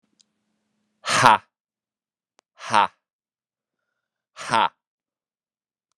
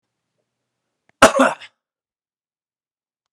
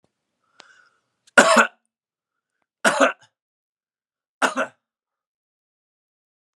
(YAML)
exhalation_length: 6.0 s
exhalation_amplitude: 32768
exhalation_signal_mean_std_ratio: 0.23
cough_length: 3.3 s
cough_amplitude: 32768
cough_signal_mean_std_ratio: 0.2
three_cough_length: 6.6 s
three_cough_amplitude: 32768
three_cough_signal_mean_std_ratio: 0.24
survey_phase: beta (2021-08-13 to 2022-03-07)
age: 18-44
gender: Male
wearing_mask: 'No'
symptom_cough_any: true
symptom_runny_or_blocked_nose: true
symptom_change_to_sense_of_smell_or_taste: true
symptom_loss_of_taste: true
symptom_onset: 4 days
smoker_status: Never smoked
respiratory_condition_asthma: false
respiratory_condition_other: false
recruitment_source: Test and Trace
submission_delay: 1 day
covid_test_result: Positive
covid_test_method: RT-qPCR
covid_ct_value: 16.7
covid_ct_gene: ORF1ab gene
covid_ct_mean: 17.0
covid_viral_load: 2700000 copies/ml
covid_viral_load_category: High viral load (>1M copies/ml)